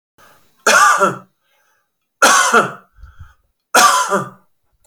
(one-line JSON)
{"three_cough_length": "4.9 s", "three_cough_amplitude": 32690, "three_cough_signal_mean_std_ratio": 0.46, "survey_phase": "beta (2021-08-13 to 2022-03-07)", "age": "45-64", "gender": "Male", "wearing_mask": "No", "symptom_runny_or_blocked_nose": true, "smoker_status": "Never smoked", "respiratory_condition_asthma": false, "respiratory_condition_other": false, "recruitment_source": "REACT", "submission_delay": "1 day", "covid_test_result": "Negative", "covid_test_method": "RT-qPCR"}